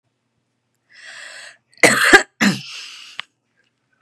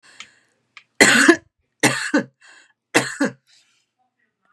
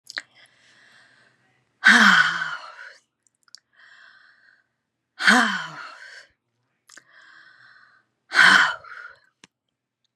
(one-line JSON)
{"cough_length": "4.0 s", "cough_amplitude": 32768, "cough_signal_mean_std_ratio": 0.3, "three_cough_length": "4.5 s", "three_cough_amplitude": 32768, "three_cough_signal_mean_std_ratio": 0.34, "exhalation_length": "10.2 s", "exhalation_amplitude": 26850, "exhalation_signal_mean_std_ratio": 0.31, "survey_phase": "beta (2021-08-13 to 2022-03-07)", "age": "45-64", "gender": "Female", "wearing_mask": "No", "symptom_none": true, "smoker_status": "Never smoked", "respiratory_condition_asthma": false, "respiratory_condition_other": false, "recruitment_source": "REACT", "submission_delay": "0 days", "covid_test_result": "Negative", "covid_test_method": "RT-qPCR", "influenza_a_test_result": "Negative", "influenza_b_test_result": "Negative"}